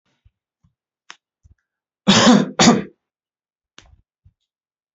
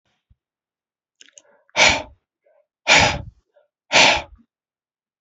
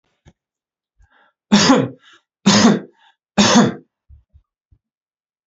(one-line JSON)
{"cough_length": "4.9 s", "cough_amplitude": 29227, "cough_signal_mean_std_ratio": 0.29, "exhalation_length": "5.2 s", "exhalation_amplitude": 31502, "exhalation_signal_mean_std_ratio": 0.31, "three_cough_length": "5.5 s", "three_cough_amplitude": 30763, "three_cough_signal_mean_std_ratio": 0.36, "survey_phase": "alpha (2021-03-01 to 2021-08-12)", "age": "45-64", "gender": "Male", "wearing_mask": "No", "symptom_none": true, "smoker_status": "Never smoked", "respiratory_condition_asthma": false, "respiratory_condition_other": false, "recruitment_source": "REACT", "submission_delay": "2 days", "covid_test_result": "Negative", "covid_test_method": "RT-qPCR"}